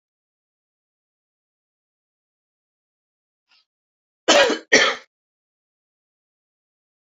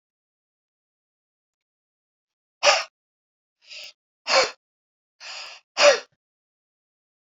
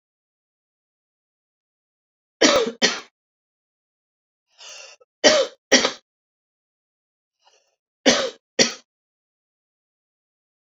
{
  "cough_length": "7.2 s",
  "cough_amplitude": 29453,
  "cough_signal_mean_std_ratio": 0.2,
  "exhalation_length": "7.3 s",
  "exhalation_amplitude": 24624,
  "exhalation_signal_mean_std_ratio": 0.23,
  "three_cough_length": "10.8 s",
  "three_cough_amplitude": 32768,
  "three_cough_signal_mean_std_ratio": 0.25,
  "survey_phase": "beta (2021-08-13 to 2022-03-07)",
  "age": "45-64",
  "gender": "Female",
  "wearing_mask": "No",
  "symptom_none": true,
  "smoker_status": "Ex-smoker",
  "respiratory_condition_asthma": true,
  "respiratory_condition_other": false,
  "recruitment_source": "REACT",
  "submission_delay": "2 days",
  "covid_test_result": "Negative",
  "covid_test_method": "RT-qPCR"
}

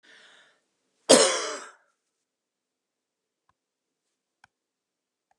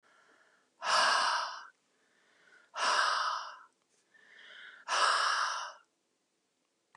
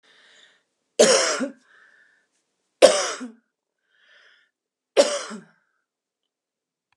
{
  "cough_length": "5.4 s",
  "cough_amplitude": 29675,
  "cough_signal_mean_std_ratio": 0.19,
  "exhalation_length": "7.0 s",
  "exhalation_amplitude": 5940,
  "exhalation_signal_mean_std_ratio": 0.49,
  "three_cough_length": "7.0 s",
  "three_cough_amplitude": 32767,
  "three_cough_signal_mean_std_ratio": 0.27,
  "survey_phase": "beta (2021-08-13 to 2022-03-07)",
  "age": "65+",
  "gender": "Female",
  "wearing_mask": "No",
  "symptom_none": true,
  "smoker_status": "Ex-smoker",
  "respiratory_condition_asthma": false,
  "respiratory_condition_other": false,
  "recruitment_source": "REACT",
  "submission_delay": "1 day",
  "covid_test_result": "Negative",
  "covid_test_method": "RT-qPCR",
  "influenza_a_test_result": "Negative",
  "influenza_b_test_result": "Negative"
}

